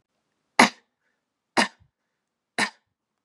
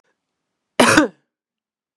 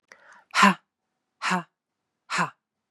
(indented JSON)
{
  "three_cough_length": "3.2 s",
  "three_cough_amplitude": 32181,
  "three_cough_signal_mean_std_ratio": 0.2,
  "cough_length": "2.0 s",
  "cough_amplitude": 32767,
  "cough_signal_mean_std_ratio": 0.29,
  "exhalation_length": "2.9 s",
  "exhalation_amplitude": 24289,
  "exhalation_signal_mean_std_ratio": 0.31,
  "survey_phase": "beta (2021-08-13 to 2022-03-07)",
  "age": "18-44",
  "gender": "Female",
  "wearing_mask": "No",
  "symptom_cough_any": true,
  "symptom_runny_or_blocked_nose": true,
  "symptom_shortness_of_breath": true,
  "symptom_fatigue": true,
  "symptom_onset": "4 days",
  "smoker_status": "Current smoker (1 to 10 cigarettes per day)",
  "respiratory_condition_asthma": false,
  "respiratory_condition_other": false,
  "recruitment_source": "Test and Trace",
  "submission_delay": "1 day",
  "covid_test_result": "Positive",
  "covid_test_method": "RT-qPCR",
  "covid_ct_value": 24.9,
  "covid_ct_gene": "ORF1ab gene",
  "covid_ct_mean": 25.7,
  "covid_viral_load": "3600 copies/ml",
  "covid_viral_load_category": "Minimal viral load (< 10K copies/ml)"
}